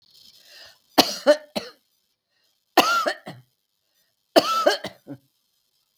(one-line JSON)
{"three_cough_length": "6.0 s", "three_cough_amplitude": 32768, "three_cough_signal_mean_std_ratio": 0.31, "survey_phase": "beta (2021-08-13 to 2022-03-07)", "age": "65+", "gender": "Female", "wearing_mask": "No", "symptom_cough_any": true, "symptom_shortness_of_breath": true, "symptom_onset": "8 days", "smoker_status": "Current smoker (1 to 10 cigarettes per day)", "respiratory_condition_asthma": false, "respiratory_condition_other": false, "recruitment_source": "REACT", "submission_delay": "1 day", "covid_test_result": "Negative", "covid_test_method": "RT-qPCR"}